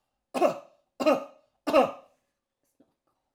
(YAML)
three_cough_length: 3.3 s
three_cough_amplitude: 11366
three_cough_signal_mean_std_ratio: 0.33
survey_phase: alpha (2021-03-01 to 2021-08-12)
age: 65+
gender: Male
wearing_mask: 'No'
symptom_none: true
smoker_status: Ex-smoker
respiratory_condition_asthma: false
respiratory_condition_other: false
recruitment_source: REACT
submission_delay: 6 days
covid_test_result: Negative
covid_test_method: RT-qPCR